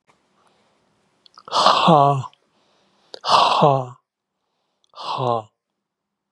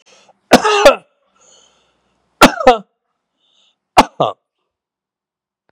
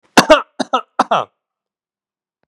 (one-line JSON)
{"exhalation_length": "6.3 s", "exhalation_amplitude": 32768, "exhalation_signal_mean_std_ratio": 0.39, "three_cough_length": "5.7 s", "three_cough_amplitude": 32768, "three_cough_signal_mean_std_ratio": 0.28, "cough_length": "2.5 s", "cough_amplitude": 32768, "cough_signal_mean_std_ratio": 0.3, "survey_phase": "beta (2021-08-13 to 2022-03-07)", "age": "65+", "gender": "Male", "wearing_mask": "No", "symptom_none": true, "smoker_status": "Ex-smoker", "respiratory_condition_asthma": true, "respiratory_condition_other": false, "recruitment_source": "REACT", "submission_delay": "2 days", "covid_test_result": "Negative", "covid_test_method": "RT-qPCR", "influenza_a_test_result": "Negative", "influenza_b_test_result": "Negative"}